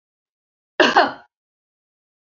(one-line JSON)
{"cough_length": "2.3 s", "cough_amplitude": 28583, "cough_signal_mean_std_ratio": 0.27, "survey_phase": "beta (2021-08-13 to 2022-03-07)", "age": "45-64", "gender": "Female", "wearing_mask": "No", "symptom_runny_or_blocked_nose": true, "symptom_sore_throat": true, "symptom_headache": true, "smoker_status": "Never smoked", "respiratory_condition_asthma": false, "respiratory_condition_other": false, "recruitment_source": "REACT", "submission_delay": "2 days", "covid_test_result": "Negative", "covid_test_method": "RT-qPCR", "influenza_a_test_result": "Negative", "influenza_b_test_result": "Negative"}